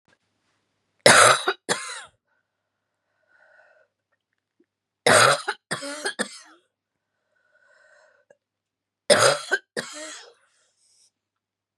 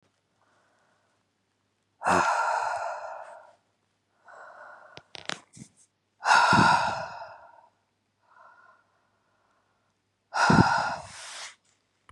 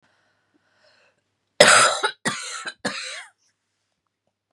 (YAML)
three_cough_length: 11.8 s
three_cough_amplitude: 32767
three_cough_signal_mean_std_ratio: 0.27
exhalation_length: 12.1 s
exhalation_amplitude: 22123
exhalation_signal_mean_std_ratio: 0.36
cough_length: 4.5 s
cough_amplitude: 32768
cough_signal_mean_std_ratio: 0.3
survey_phase: beta (2021-08-13 to 2022-03-07)
age: 45-64
gender: Female
wearing_mask: 'No'
symptom_cough_any: true
symptom_runny_or_blocked_nose: true
smoker_status: Never smoked
respiratory_condition_asthma: true
respiratory_condition_other: false
recruitment_source: REACT
submission_delay: 26 days
covid_test_result: Negative
covid_test_method: RT-qPCR
influenza_a_test_result: Negative
influenza_b_test_result: Negative